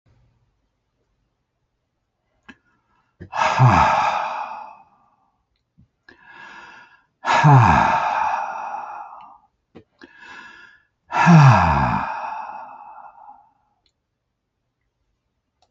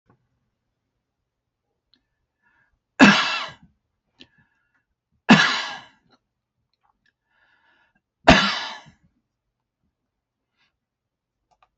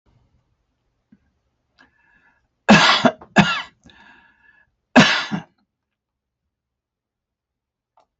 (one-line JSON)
{"exhalation_length": "15.7 s", "exhalation_amplitude": 26575, "exhalation_signal_mean_std_ratio": 0.38, "three_cough_length": "11.8 s", "three_cough_amplitude": 28825, "three_cough_signal_mean_std_ratio": 0.21, "cough_length": "8.2 s", "cough_amplitude": 32767, "cough_signal_mean_std_ratio": 0.26, "survey_phase": "beta (2021-08-13 to 2022-03-07)", "age": "65+", "gender": "Male", "wearing_mask": "No", "symptom_none": true, "smoker_status": "Ex-smoker", "respiratory_condition_asthma": false, "respiratory_condition_other": false, "recruitment_source": "REACT", "submission_delay": "6 days", "covid_test_result": "Negative", "covid_test_method": "RT-qPCR"}